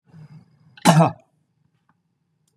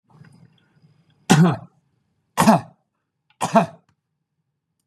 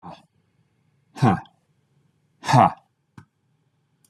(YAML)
cough_length: 2.6 s
cough_amplitude: 30789
cough_signal_mean_std_ratio: 0.26
three_cough_length: 4.9 s
three_cough_amplitude: 31935
three_cough_signal_mean_std_ratio: 0.29
exhalation_length: 4.1 s
exhalation_amplitude: 24981
exhalation_signal_mean_std_ratio: 0.25
survey_phase: beta (2021-08-13 to 2022-03-07)
age: 65+
gender: Male
wearing_mask: 'No'
symptom_none: true
smoker_status: Ex-smoker
respiratory_condition_asthma: false
respiratory_condition_other: false
recruitment_source: REACT
submission_delay: 2 days
covid_test_result: Negative
covid_test_method: RT-qPCR
influenza_a_test_result: Negative
influenza_b_test_result: Negative